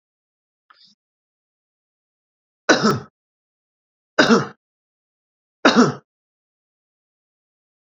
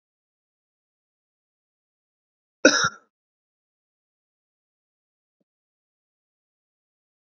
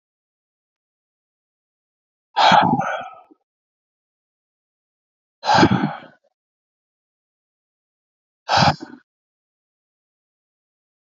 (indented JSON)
{
  "three_cough_length": "7.9 s",
  "three_cough_amplitude": 32767,
  "three_cough_signal_mean_std_ratio": 0.24,
  "cough_length": "7.3 s",
  "cough_amplitude": 31106,
  "cough_signal_mean_std_ratio": 0.12,
  "exhalation_length": "11.0 s",
  "exhalation_amplitude": 27264,
  "exhalation_signal_mean_std_ratio": 0.27,
  "survey_phase": "beta (2021-08-13 to 2022-03-07)",
  "age": "45-64",
  "gender": "Male",
  "wearing_mask": "No",
  "symptom_none": true,
  "smoker_status": "Never smoked",
  "respiratory_condition_asthma": false,
  "respiratory_condition_other": false,
  "recruitment_source": "REACT",
  "submission_delay": "2 days",
  "covid_test_result": "Negative",
  "covid_test_method": "RT-qPCR",
  "influenza_a_test_result": "Unknown/Void",
  "influenza_b_test_result": "Unknown/Void"
}